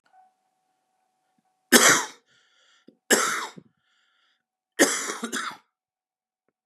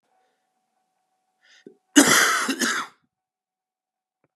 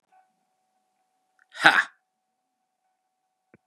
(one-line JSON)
{"three_cough_length": "6.7 s", "three_cough_amplitude": 29802, "three_cough_signal_mean_std_ratio": 0.29, "cough_length": "4.4 s", "cough_amplitude": 32000, "cough_signal_mean_std_ratio": 0.31, "exhalation_length": "3.7 s", "exhalation_amplitude": 32767, "exhalation_signal_mean_std_ratio": 0.17, "survey_phase": "beta (2021-08-13 to 2022-03-07)", "age": "45-64", "gender": "Male", "wearing_mask": "No", "symptom_cough_any": true, "symptom_runny_or_blocked_nose": true, "symptom_fatigue": true, "symptom_headache": true, "symptom_change_to_sense_of_smell_or_taste": true, "symptom_loss_of_taste": true, "symptom_onset": "8 days", "smoker_status": "Ex-smoker", "respiratory_condition_asthma": false, "respiratory_condition_other": false, "recruitment_source": "Test and Trace", "submission_delay": "2 days", "covid_test_result": "Positive", "covid_test_method": "RT-qPCR", "covid_ct_value": 16.8, "covid_ct_gene": "ORF1ab gene", "covid_ct_mean": 17.2, "covid_viral_load": "2300000 copies/ml", "covid_viral_load_category": "High viral load (>1M copies/ml)"}